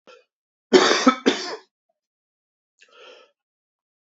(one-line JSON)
{"cough_length": "4.2 s", "cough_amplitude": 28430, "cough_signal_mean_std_ratio": 0.27, "survey_phase": "beta (2021-08-13 to 2022-03-07)", "age": "18-44", "gender": "Male", "wearing_mask": "No", "symptom_cough_any": true, "symptom_runny_or_blocked_nose": true, "symptom_shortness_of_breath": true, "symptom_onset": "4 days", "smoker_status": "Never smoked", "respiratory_condition_asthma": false, "respiratory_condition_other": false, "recruitment_source": "REACT", "submission_delay": "3 days", "covid_test_result": "Negative", "covid_test_method": "RT-qPCR", "covid_ct_value": 38.8, "covid_ct_gene": "N gene", "influenza_a_test_result": "Negative", "influenza_b_test_result": "Negative"}